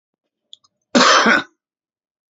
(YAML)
cough_length: 2.3 s
cough_amplitude: 29702
cough_signal_mean_std_ratio: 0.37
survey_phase: beta (2021-08-13 to 2022-03-07)
age: 65+
gender: Male
wearing_mask: 'No'
symptom_none: true
smoker_status: Current smoker (11 or more cigarettes per day)
respiratory_condition_asthma: false
respiratory_condition_other: false
recruitment_source: REACT
submission_delay: 1 day
covid_test_result: Negative
covid_test_method: RT-qPCR
influenza_a_test_result: Negative
influenza_b_test_result: Negative